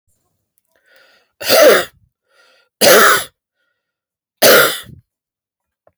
{
  "three_cough_length": "6.0 s",
  "three_cough_amplitude": 32768,
  "three_cough_signal_mean_std_ratio": 0.37,
  "survey_phase": "beta (2021-08-13 to 2022-03-07)",
  "age": "45-64",
  "gender": "Male",
  "wearing_mask": "No",
  "symptom_none": true,
  "smoker_status": "Never smoked",
  "respiratory_condition_asthma": false,
  "respiratory_condition_other": false,
  "recruitment_source": "REACT",
  "submission_delay": "2 days",
  "covid_test_result": "Negative",
  "covid_test_method": "RT-qPCR",
  "influenza_a_test_result": "Negative",
  "influenza_b_test_result": "Negative"
}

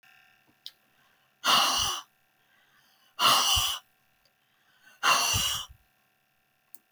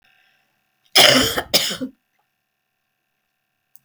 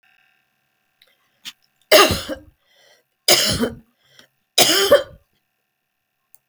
{
  "exhalation_length": "6.9 s",
  "exhalation_amplitude": 13533,
  "exhalation_signal_mean_std_ratio": 0.41,
  "cough_length": "3.8 s",
  "cough_amplitude": 32768,
  "cough_signal_mean_std_ratio": 0.31,
  "three_cough_length": "6.5 s",
  "three_cough_amplitude": 32768,
  "three_cough_signal_mean_std_ratio": 0.32,
  "survey_phase": "alpha (2021-03-01 to 2021-08-12)",
  "age": "65+",
  "gender": "Female",
  "wearing_mask": "No",
  "symptom_none": true,
  "smoker_status": "Never smoked",
  "respiratory_condition_asthma": false,
  "respiratory_condition_other": false,
  "recruitment_source": "REACT",
  "submission_delay": "1 day",
  "covid_test_result": "Negative",
  "covid_test_method": "RT-qPCR"
}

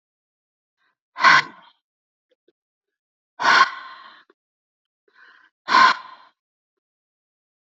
{
  "exhalation_length": "7.7 s",
  "exhalation_amplitude": 27145,
  "exhalation_signal_mean_std_ratio": 0.26,
  "survey_phase": "alpha (2021-03-01 to 2021-08-12)",
  "age": "45-64",
  "gender": "Female",
  "wearing_mask": "No",
  "symptom_none": true,
  "smoker_status": "Ex-smoker",
  "respiratory_condition_asthma": false,
  "respiratory_condition_other": false,
  "recruitment_source": "REACT",
  "submission_delay": "2 days",
  "covid_test_result": "Negative",
  "covid_test_method": "RT-qPCR"
}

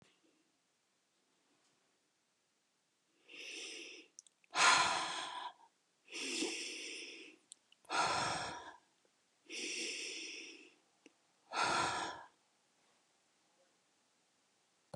{
  "exhalation_length": "15.0 s",
  "exhalation_amplitude": 5191,
  "exhalation_signal_mean_std_ratio": 0.4,
  "survey_phase": "beta (2021-08-13 to 2022-03-07)",
  "age": "45-64",
  "gender": "Female",
  "wearing_mask": "No",
  "symptom_none": true,
  "smoker_status": "Never smoked",
  "respiratory_condition_asthma": false,
  "respiratory_condition_other": false,
  "recruitment_source": "REACT",
  "submission_delay": "1 day",
  "covid_test_result": "Negative",
  "covid_test_method": "RT-qPCR",
  "influenza_a_test_result": "Negative",
  "influenza_b_test_result": "Negative"
}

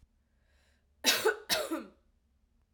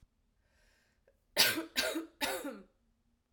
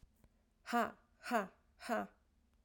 {
  "cough_length": "2.7 s",
  "cough_amplitude": 8138,
  "cough_signal_mean_std_ratio": 0.36,
  "three_cough_length": "3.3 s",
  "three_cough_amplitude": 10627,
  "three_cough_signal_mean_std_ratio": 0.38,
  "exhalation_length": "2.6 s",
  "exhalation_amplitude": 2891,
  "exhalation_signal_mean_std_ratio": 0.38,
  "survey_phase": "alpha (2021-03-01 to 2021-08-12)",
  "age": "18-44",
  "gender": "Female",
  "wearing_mask": "No",
  "symptom_cough_any": true,
  "symptom_shortness_of_breath": true,
  "symptom_fever_high_temperature": true,
  "symptom_headache": true,
  "symptom_onset": "3 days",
  "smoker_status": "Never smoked",
  "respiratory_condition_asthma": false,
  "respiratory_condition_other": false,
  "recruitment_source": "Test and Trace",
  "submission_delay": "2 days",
  "covid_test_result": "Positive",
  "covid_test_method": "RT-qPCR",
  "covid_ct_value": 14.1,
  "covid_ct_gene": "ORF1ab gene",
  "covid_ct_mean": 15.0,
  "covid_viral_load": "12000000 copies/ml",
  "covid_viral_load_category": "High viral load (>1M copies/ml)"
}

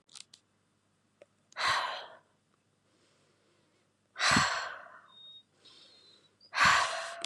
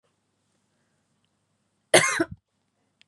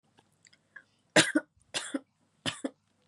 {
  "exhalation_length": "7.3 s",
  "exhalation_amplitude": 8624,
  "exhalation_signal_mean_std_ratio": 0.36,
  "cough_length": "3.1 s",
  "cough_amplitude": 27049,
  "cough_signal_mean_std_ratio": 0.22,
  "three_cough_length": "3.1 s",
  "three_cough_amplitude": 15940,
  "three_cough_signal_mean_std_ratio": 0.26,
  "survey_phase": "beta (2021-08-13 to 2022-03-07)",
  "age": "18-44",
  "gender": "Female",
  "wearing_mask": "No",
  "symptom_none": true,
  "smoker_status": "Never smoked",
  "respiratory_condition_asthma": false,
  "respiratory_condition_other": false,
  "recruitment_source": "REACT",
  "submission_delay": "3 days",
  "covid_test_result": "Negative",
  "covid_test_method": "RT-qPCR",
  "influenza_a_test_result": "Negative",
  "influenza_b_test_result": "Negative"
}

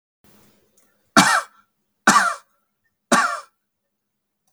{
  "three_cough_length": "4.5 s",
  "three_cough_amplitude": 32544,
  "three_cough_signal_mean_std_ratio": 0.32,
  "survey_phase": "beta (2021-08-13 to 2022-03-07)",
  "age": "18-44",
  "gender": "Male",
  "wearing_mask": "No",
  "symptom_none": true,
  "smoker_status": "Never smoked",
  "respiratory_condition_asthma": false,
  "respiratory_condition_other": false,
  "recruitment_source": "REACT",
  "submission_delay": "1 day",
  "covid_test_result": "Negative",
  "covid_test_method": "RT-qPCR",
  "influenza_a_test_result": "Negative",
  "influenza_b_test_result": "Negative"
}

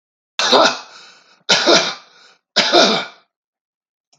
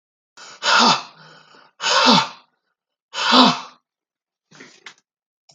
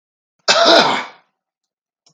{
  "three_cough_length": "4.2 s",
  "three_cough_amplitude": 32768,
  "three_cough_signal_mean_std_ratio": 0.45,
  "exhalation_length": "5.5 s",
  "exhalation_amplitude": 32766,
  "exhalation_signal_mean_std_ratio": 0.38,
  "cough_length": "2.1 s",
  "cough_amplitude": 32768,
  "cough_signal_mean_std_ratio": 0.41,
  "survey_phase": "beta (2021-08-13 to 2022-03-07)",
  "age": "65+",
  "gender": "Male",
  "wearing_mask": "No",
  "symptom_none": true,
  "smoker_status": "Ex-smoker",
  "respiratory_condition_asthma": false,
  "respiratory_condition_other": false,
  "recruitment_source": "REACT",
  "submission_delay": "1 day",
  "covid_test_result": "Negative",
  "covid_test_method": "RT-qPCR",
  "influenza_a_test_result": "Negative",
  "influenza_b_test_result": "Negative"
}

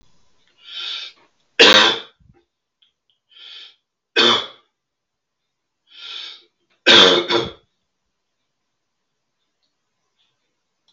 {
  "three_cough_length": "10.9 s",
  "three_cough_amplitude": 32768,
  "three_cough_signal_mean_std_ratio": 0.28,
  "survey_phase": "beta (2021-08-13 to 2022-03-07)",
  "age": "65+",
  "gender": "Male",
  "wearing_mask": "No",
  "symptom_cough_any": true,
  "symptom_runny_or_blocked_nose": true,
  "symptom_sore_throat": true,
  "symptom_onset": "8 days",
  "smoker_status": "Never smoked",
  "respiratory_condition_asthma": false,
  "respiratory_condition_other": false,
  "recruitment_source": "REACT",
  "submission_delay": "1 day",
  "covid_test_result": "Negative",
  "covid_test_method": "RT-qPCR",
  "influenza_a_test_result": "Negative",
  "influenza_b_test_result": "Negative"
}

